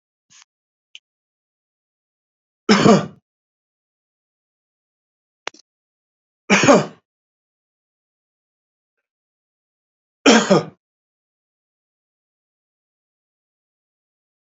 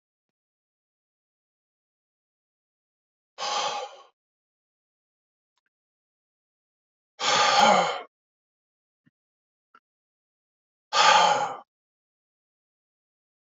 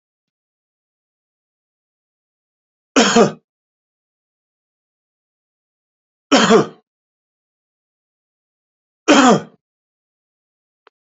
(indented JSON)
{
  "three_cough_length": "14.5 s",
  "three_cough_amplitude": 31711,
  "three_cough_signal_mean_std_ratio": 0.2,
  "exhalation_length": "13.5 s",
  "exhalation_amplitude": 17298,
  "exhalation_signal_mean_std_ratio": 0.27,
  "cough_length": "11.0 s",
  "cough_amplitude": 29661,
  "cough_signal_mean_std_ratio": 0.24,
  "survey_phase": "beta (2021-08-13 to 2022-03-07)",
  "age": "65+",
  "gender": "Male",
  "wearing_mask": "No",
  "symptom_none": true,
  "smoker_status": "Ex-smoker",
  "respiratory_condition_asthma": false,
  "respiratory_condition_other": false,
  "recruitment_source": "REACT",
  "submission_delay": "3 days",
  "covid_test_result": "Negative",
  "covid_test_method": "RT-qPCR",
  "influenza_a_test_result": "Negative",
  "influenza_b_test_result": "Negative"
}